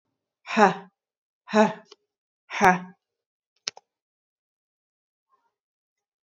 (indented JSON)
{
  "exhalation_length": "6.2 s",
  "exhalation_amplitude": 26334,
  "exhalation_signal_mean_std_ratio": 0.23,
  "survey_phase": "beta (2021-08-13 to 2022-03-07)",
  "age": "18-44",
  "gender": "Female",
  "wearing_mask": "No",
  "symptom_none": true,
  "smoker_status": "Never smoked",
  "respiratory_condition_asthma": false,
  "respiratory_condition_other": false,
  "recruitment_source": "REACT",
  "submission_delay": "1 day",
  "covid_test_result": "Negative",
  "covid_test_method": "RT-qPCR",
  "influenza_a_test_result": "Negative",
  "influenza_b_test_result": "Negative"
}